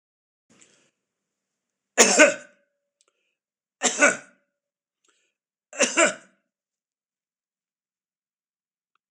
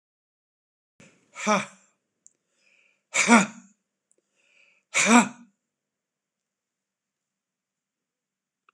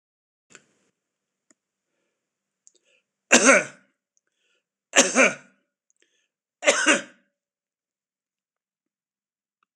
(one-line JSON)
{"cough_length": "9.1 s", "cough_amplitude": 26028, "cough_signal_mean_std_ratio": 0.23, "exhalation_length": "8.7 s", "exhalation_amplitude": 24418, "exhalation_signal_mean_std_ratio": 0.23, "three_cough_length": "9.8 s", "three_cough_amplitude": 26028, "three_cough_signal_mean_std_ratio": 0.23, "survey_phase": "beta (2021-08-13 to 2022-03-07)", "age": "65+", "gender": "Male", "wearing_mask": "No", "symptom_none": true, "smoker_status": "Never smoked", "respiratory_condition_asthma": false, "respiratory_condition_other": false, "recruitment_source": "REACT", "submission_delay": "2 days", "covid_test_result": "Negative", "covid_test_method": "RT-qPCR"}